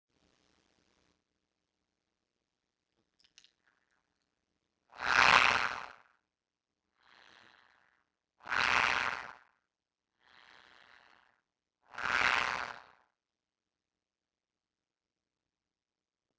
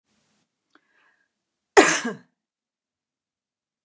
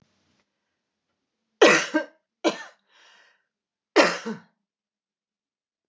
exhalation_length: 16.4 s
exhalation_amplitude: 13461
exhalation_signal_mean_std_ratio: 0.17
cough_length: 3.8 s
cough_amplitude: 29203
cough_signal_mean_std_ratio: 0.18
three_cough_length: 5.9 s
three_cough_amplitude: 25253
three_cough_signal_mean_std_ratio: 0.25
survey_phase: beta (2021-08-13 to 2022-03-07)
age: 45-64
gender: Female
wearing_mask: 'No'
symptom_none: true
smoker_status: Ex-smoker
respiratory_condition_asthma: false
respiratory_condition_other: false
recruitment_source: REACT
submission_delay: 1 day
covid_test_result: Negative
covid_test_method: RT-qPCR
influenza_a_test_result: Negative
influenza_b_test_result: Negative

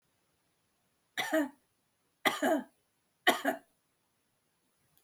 three_cough_length: 5.0 s
three_cough_amplitude: 10502
three_cough_signal_mean_std_ratio: 0.31
survey_phase: beta (2021-08-13 to 2022-03-07)
age: 45-64
gender: Female
wearing_mask: 'No'
symptom_none: true
smoker_status: Ex-smoker
respiratory_condition_asthma: true
respiratory_condition_other: false
recruitment_source: REACT
submission_delay: 5 days
covid_test_result: Negative
covid_test_method: RT-qPCR
influenza_a_test_result: Negative
influenza_b_test_result: Negative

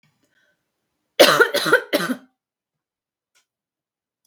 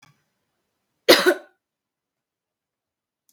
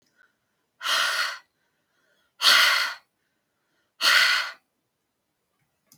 three_cough_length: 4.3 s
three_cough_amplitude: 32768
three_cough_signal_mean_std_ratio: 0.29
cough_length: 3.3 s
cough_amplitude: 32768
cough_signal_mean_std_ratio: 0.2
exhalation_length: 6.0 s
exhalation_amplitude: 19314
exhalation_signal_mean_std_ratio: 0.39
survey_phase: beta (2021-08-13 to 2022-03-07)
age: 18-44
gender: Female
wearing_mask: 'No'
symptom_none: true
symptom_onset: 13 days
smoker_status: Never smoked
respiratory_condition_asthma: false
respiratory_condition_other: false
recruitment_source: REACT
submission_delay: 1 day
covid_test_result: Negative
covid_test_method: RT-qPCR
influenza_a_test_result: Negative
influenza_b_test_result: Negative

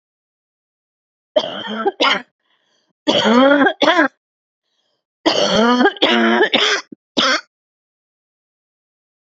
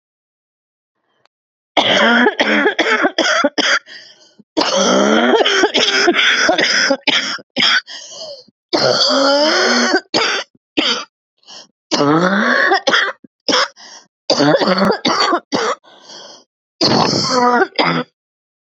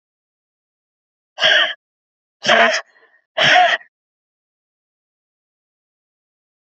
three_cough_length: 9.2 s
three_cough_amplitude: 29333
three_cough_signal_mean_std_ratio: 0.49
cough_length: 18.8 s
cough_amplitude: 32768
cough_signal_mean_std_ratio: 0.69
exhalation_length: 6.7 s
exhalation_amplitude: 29358
exhalation_signal_mean_std_ratio: 0.32
survey_phase: beta (2021-08-13 to 2022-03-07)
age: 45-64
gender: Female
wearing_mask: 'No'
symptom_cough_any: true
symptom_new_continuous_cough: true
symptom_fatigue: true
smoker_status: Current smoker (1 to 10 cigarettes per day)
respiratory_condition_asthma: false
respiratory_condition_other: false
recruitment_source: REACT
submission_delay: 2 days
covid_test_result: Negative
covid_test_method: RT-qPCR
influenza_a_test_result: Negative
influenza_b_test_result: Negative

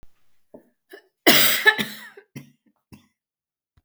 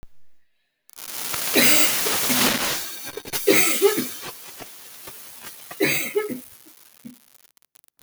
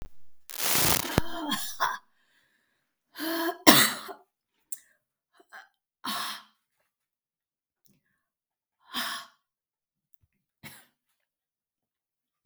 cough_length: 3.8 s
cough_amplitude: 32766
cough_signal_mean_std_ratio: 0.3
three_cough_length: 8.0 s
three_cough_amplitude: 24740
three_cough_signal_mean_std_ratio: 0.53
exhalation_length: 12.5 s
exhalation_amplitude: 32766
exhalation_signal_mean_std_ratio: 0.3
survey_phase: beta (2021-08-13 to 2022-03-07)
age: 45-64
gender: Female
wearing_mask: 'No'
symptom_cough_any: true
symptom_shortness_of_breath: true
symptom_diarrhoea: true
symptom_fatigue: true
symptom_headache: true
symptom_onset: 8 days
smoker_status: Never smoked
respiratory_condition_asthma: false
respiratory_condition_other: false
recruitment_source: Test and Trace
submission_delay: 1 day
covid_test_result: Negative
covid_test_method: RT-qPCR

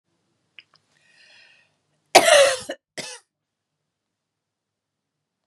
cough_length: 5.5 s
cough_amplitude: 32768
cough_signal_mean_std_ratio: 0.22
survey_phase: beta (2021-08-13 to 2022-03-07)
age: 65+
gender: Female
wearing_mask: 'No'
symptom_none: true
smoker_status: Ex-smoker
respiratory_condition_asthma: false
respiratory_condition_other: false
recruitment_source: REACT
submission_delay: 2 days
covid_test_result: Negative
covid_test_method: RT-qPCR
influenza_a_test_result: Negative
influenza_b_test_result: Negative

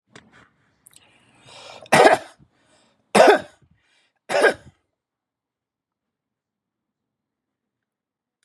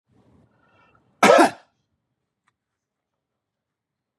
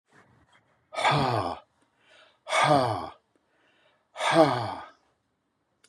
three_cough_length: 8.4 s
three_cough_amplitude: 32768
three_cough_signal_mean_std_ratio: 0.23
cough_length: 4.2 s
cough_amplitude: 29300
cough_signal_mean_std_ratio: 0.2
exhalation_length: 5.9 s
exhalation_amplitude: 17531
exhalation_signal_mean_std_ratio: 0.42
survey_phase: beta (2021-08-13 to 2022-03-07)
age: 65+
gender: Male
wearing_mask: 'No'
symptom_none: true
smoker_status: Ex-smoker
respiratory_condition_asthma: false
respiratory_condition_other: false
recruitment_source: REACT
submission_delay: 0 days
covid_test_result: Negative
covid_test_method: RT-qPCR
influenza_a_test_result: Negative
influenza_b_test_result: Negative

